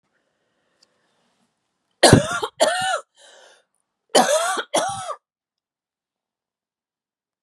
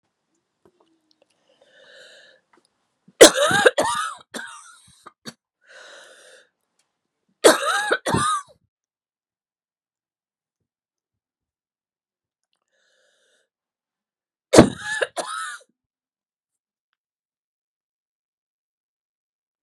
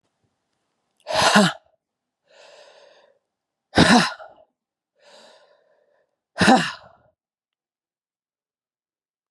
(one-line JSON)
{"cough_length": "7.4 s", "cough_amplitude": 32768, "cough_signal_mean_std_ratio": 0.32, "three_cough_length": "19.6 s", "three_cough_amplitude": 32768, "three_cough_signal_mean_std_ratio": 0.21, "exhalation_length": "9.3 s", "exhalation_amplitude": 31080, "exhalation_signal_mean_std_ratio": 0.26, "survey_phase": "beta (2021-08-13 to 2022-03-07)", "age": "45-64", "gender": "Female", "wearing_mask": "No", "symptom_cough_any": true, "symptom_runny_or_blocked_nose": true, "symptom_sore_throat": true, "symptom_diarrhoea": true, "symptom_fatigue": true, "symptom_headache": true, "symptom_change_to_sense_of_smell_or_taste": true, "symptom_loss_of_taste": true, "symptom_onset": "3 days", "smoker_status": "Ex-smoker", "respiratory_condition_asthma": false, "respiratory_condition_other": false, "recruitment_source": "Test and Trace", "submission_delay": "2 days", "covid_test_result": "Positive", "covid_test_method": "RT-qPCR", "covid_ct_value": 20.2, "covid_ct_gene": "ORF1ab gene", "covid_ct_mean": 20.8, "covid_viral_load": "150000 copies/ml", "covid_viral_load_category": "Low viral load (10K-1M copies/ml)"}